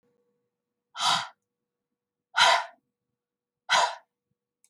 {"exhalation_length": "4.7 s", "exhalation_amplitude": 15259, "exhalation_signal_mean_std_ratio": 0.31, "survey_phase": "alpha (2021-03-01 to 2021-08-12)", "age": "65+", "gender": "Female", "wearing_mask": "No", "symptom_none": true, "smoker_status": "Never smoked", "respiratory_condition_asthma": false, "respiratory_condition_other": false, "recruitment_source": "REACT", "submission_delay": "3 days", "covid_test_result": "Negative", "covid_test_method": "RT-qPCR"}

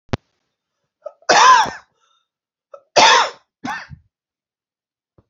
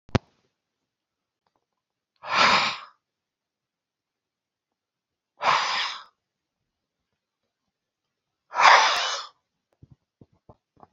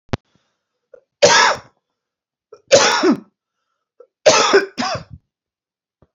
{"cough_length": "5.3 s", "cough_amplitude": 32767, "cough_signal_mean_std_ratio": 0.32, "exhalation_length": "10.9 s", "exhalation_amplitude": 27685, "exhalation_signal_mean_std_ratio": 0.28, "three_cough_length": "6.1 s", "three_cough_amplitude": 32767, "three_cough_signal_mean_std_ratio": 0.38, "survey_phase": "alpha (2021-03-01 to 2021-08-12)", "age": "45-64", "gender": "Male", "wearing_mask": "No", "symptom_cough_any": true, "symptom_shortness_of_breath": true, "symptom_fatigue": true, "symptom_change_to_sense_of_smell_or_taste": true, "symptom_loss_of_taste": true, "symptom_onset": "4 days", "smoker_status": "Never smoked", "respiratory_condition_asthma": false, "respiratory_condition_other": false, "recruitment_source": "Test and Trace", "submission_delay": "2 days", "covid_test_result": "Positive", "covid_test_method": "RT-qPCR", "covid_ct_value": 23.0, "covid_ct_gene": "ORF1ab gene", "covid_ct_mean": 24.5, "covid_viral_load": "9300 copies/ml", "covid_viral_load_category": "Minimal viral load (< 10K copies/ml)"}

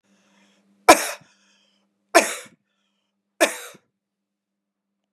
{"three_cough_length": "5.1 s", "three_cough_amplitude": 32768, "three_cough_signal_mean_std_ratio": 0.2, "survey_phase": "beta (2021-08-13 to 2022-03-07)", "age": "45-64", "gender": "Male", "wearing_mask": "No", "symptom_runny_or_blocked_nose": true, "smoker_status": "Never smoked", "respiratory_condition_asthma": false, "respiratory_condition_other": false, "recruitment_source": "REACT", "submission_delay": "3 days", "covid_test_result": "Negative", "covid_test_method": "RT-qPCR", "influenza_a_test_result": "Negative", "influenza_b_test_result": "Negative"}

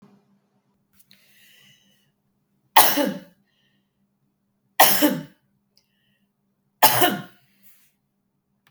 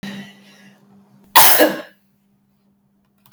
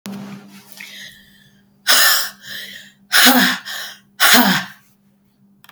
{"three_cough_length": "8.7 s", "three_cough_amplitude": 32768, "three_cough_signal_mean_std_ratio": 0.26, "cough_length": "3.3 s", "cough_amplitude": 32768, "cough_signal_mean_std_ratio": 0.3, "exhalation_length": "5.7 s", "exhalation_amplitude": 32768, "exhalation_signal_mean_std_ratio": 0.44, "survey_phase": "beta (2021-08-13 to 2022-03-07)", "age": "65+", "gender": "Female", "wearing_mask": "No", "symptom_none": true, "symptom_onset": "3 days", "smoker_status": "Never smoked", "respiratory_condition_asthma": false, "respiratory_condition_other": false, "recruitment_source": "Test and Trace", "submission_delay": "2 days", "covid_test_result": "Negative", "covid_test_method": "LAMP"}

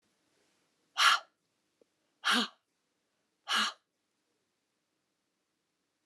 {"exhalation_length": "6.1 s", "exhalation_amplitude": 9442, "exhalation_signal_mean_std_ratio": 0.25, "survey_phase": "alpha (2021-03-01 to 2021-08-12)", "age": "65+", "gender": "Female", "wearing_mask": "No", "symptom_none": true, "smoker_status": "Never smoked", "respiratory_condition_asthma": false, "respiratory_condition_other": false, "recruitment_source": "REACT", "submission_delay": "1 day", "covid_test_result": "Negative", "covid_test_method": "RT-qPCR"}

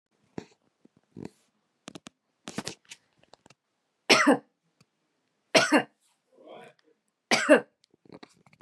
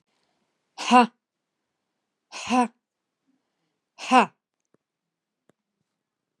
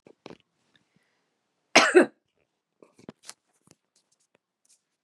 {"three_cough_length": "8.6 s", "three_cough_amplitude": 21625, "three_cough_signal_mean_std_ratio": 0.24, "exhalation_length": "6.4 s", "exhalation_amplitude": 24426, "exhalation_signal_mean_std_ratio": 0.22, "cough_length": "5.0 s", "cough_amplitude": 28625, "cough_signal_mean_std_ratio": 0.18, "survey_phase": "beta (2021-08-13 to 2022-03-07)", "age": "45-64", "gender": "Female", "wearing_mask": "No", "symptom_none": true, "smoker_status": "Never smoked", "respiratory_condition_asthma": false, "respiratory_condition_other": false, "recruitment_source": "REACT", "submission_delay": "3 days", "covid_test_result": "Negative", "covid_test_method": "RT-qPCR", "influenza_a_test_result": "Unknown/Void", "influenza_b_test_result": "Unknown/Void"}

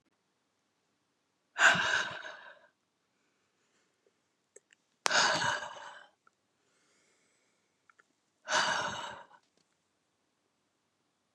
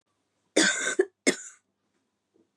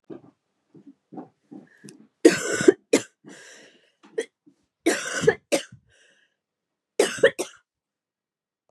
{"exhalation_length": "11.3 s", "exhalation_amplitude": 16500, "exhalation_signal_mean_std_ratio": 0.3, "cough_length": "2.6 s", "cough_amplitude": 13530, "cough_signal_mean_std_ratio": 0.34, "three_cough_length": "8.7 s", "three_cough_amplitude": 30969, "three_cough_signal_mean_std_ratio": 0.26, "survey_phase": "beta (2021-08-13 to 2022-03-07)", "age": "45-64", "gender": "Female", "wearing_mask": "No", "symptom_cough_any": true, "symptom_runny_or_blocked_nose": true, "symptom_shortness_of_breath": true, "symptom_sore_throat": true, "symptom_abdominal_pain": true, "symptom_fatigue": true, "symptom_other": true, "symptom_onset": "2 days", "smoker_status": "Never smoked", "respiratory_condition_asthma": false, "respiratory_condition_other": false, "recruitment_source": "Test and Trace", "submission_delay": "1 day", "covid_test_result": "Positive", "covid_test_method": "RT-qPCR", "covid_ct_value": 26.1, "covid_ct_gene": "N gene"}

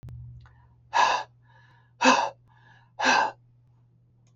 {"exhalation_length": "4.4 s", "exhalation_amplitude": 16137, "exhalation_signal_mean_std_ratio": 0.39, "survey_phase": "beta (2021-08-13 to 2022-03-07)", "age": "65+", "gender": "Female", "wearing_mask": "No", "symptom_none": true, "smoker_status": "Ex-smoker", "respiratory_condition_asthma": false, "respiratory_condition_other": false, "recruitment_source": "REACT", "submission_delay": "1 day", "covid_test_result": "Negative", "covid_test_method": "RT-qPCR"}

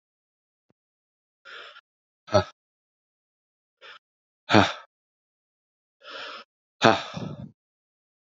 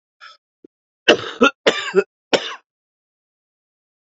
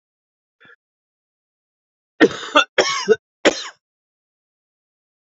{"exhalation_length": "8.4 s", "exhalation_amplitude": 28850, "exhalation_signal_mean_std_ratio": 0.21, "cough_length": "4.0 s", "cough_amplitude": 32767, "cough_signal_mean_std_ratio": 0.28, "three_cough_length": "5.4 s", "three_cough_amplitude": 28657, "three_cough_signal_mean_std_ratio": 0.25, "survey_phase": "beta (2021-08-13 to 2022-03-07)", "age": "45-64", "gender": "Male", "wearing_mask": "No", "symptom_cough_any": true, "symptom_new_continuous_cough": true, "symptom_runny_or_blocked_nose": true, "symptom_sore_throat": true, "symptom_fatigue": true, "symptom_fever_high_temperature": true, "symptom_headache": true, "symptom_change_to_sense_of_smell_or_taste": true, "symptom_loss_of_taste": true, "smoker_status": "Never smoked", "respiratory_condition_asthma": false, "respiratory_condition_other": false, "recruitment_source": "Test and Trace", "submission_delay": "1 day", "covid_test_result": "Positive", "covid_test_method": "LFT"}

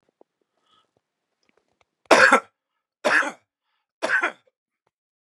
{"three_cough_length": "5.4 s", "three_cough_amplitude": 32767, "three_cough_signal_mean_std_ratio": 0.27, "survey_phase": "beta (2021-08-13 to 2022-03-07)", "age": "65+", "gender": "Male", "wearing_mask": "No", "symptom_none": true, "smoker_status": "Ex-smoker", "respiratory_condition_asthma": false, "respiratory_condition_other": false, "recruitment_source": "REACT", "submission_delay": "2 days", "covid_test_result": "Negative", "covid_test_method": "RT-qPCR", "influenza_a_test_result": "Negative", "influenza_b_test_result": "Negative"}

